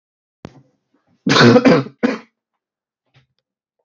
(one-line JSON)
{"cough_length": "3.8 s", "cough_amplitude": 32768, "cough_signal_mean_std_ratio": 0.34, "survey_phase": "beta (2021-08-13 to 2022-03-07)", "age": "18-44", "gender": "Male", "wearing_mask": "No", "symptom_cough_any": true, "symptom_sore_throat": true, "symptom_onset": "2 days", "smoker_status": "Never smoked", "respiratory_condition_asthma": false, "respiratory_condition_other": false, "recruitment_source": "Test and Trace", "submission_delay": "1 day", "covid_test_result": "Positive", "covid_test_method": "RT-qPCR", "covid_ct_value": 23.1, "covid_ct_gene": "N gene", "covid_ct_mean": 23.2, "covid_viral_load": "24000 copies/ml", "covid_viral_load_category": "Low viral load (10K-1M copies/ml)"}